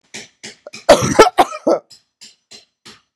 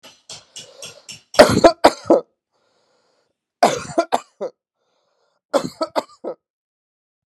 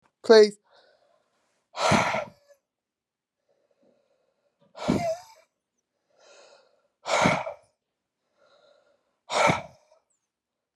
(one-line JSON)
{"cough_length": "3.2 s", "cough_amplitude": 32768, "cough_signal_mean_std_ratio": 0.33, "three_cough_length": "7.3 s", "three_cough_amplitude": 32768, "three_cough_signal_mean_std_ratio": 0.27, "exhalation_length": "10.8 s", "exhalation_amplitude": 21221, "exhalation_signal_mean_std_ratio": 0.28, "survey_phase": "beta (2021-08-13 to 2022-03-07)", "age": "45-64", "gender": "Female", "wearing_mask": "No", "symptom_runny_or_blocked_nose": true, "symptom_diarrhoea": true, "symptom_fatigue": true, "symptom_headache": true, "symptom_change_to_sense_of_smell_or_taste": true, "symptom_onset": "5 days", "smoker_status": "Current smoker (e-cigarettes or vapes only)", "respiratory_condition_asthma": false, "respiratory_condition_other": false, "recruitment_source": "Test and Trace", "submission_delay": "2 days", "covid_test_result": "Positive", "covid_test_method": "RT-qPCR", "covid_ct_value": 17.2, "covid_ct_gene": "ORF1ab gene", "covid_ct_mean": 17.2, "covid_viral_load": "2300000 copies/ml", "covid_viral_load_category": "High viral load (>1M copies/ml)"}